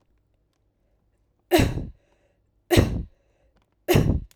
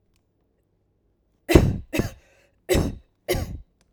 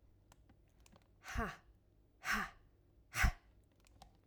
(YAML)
three_cough_length: 4.4 s
three_cough_amplitude: 26973
three_cough_signal_mean_std_ratio: 0.35
cough_length: 3.9 s
cough_amplitude: 32768
cough_signal_mean_std_ratio: 0.33
exhalation_length: 4.3 s
exhalation_amplitude: 3289
exhalation_signal_mean_std_ratio: 0.32
survey_phase: alpha (2021-03-01 to 2021-08-12)
age: 18-44
gender: Female
wearing_mask: 'No'
symptom_none: true
smoker_status: Ex-smoker
respiratory_condition_asthma: false
respiratory_condition_other: false
recruitment_source: REACT
submission_delay: 3 days
covid_test_result: Negative
covid_test_method: RT-qPCR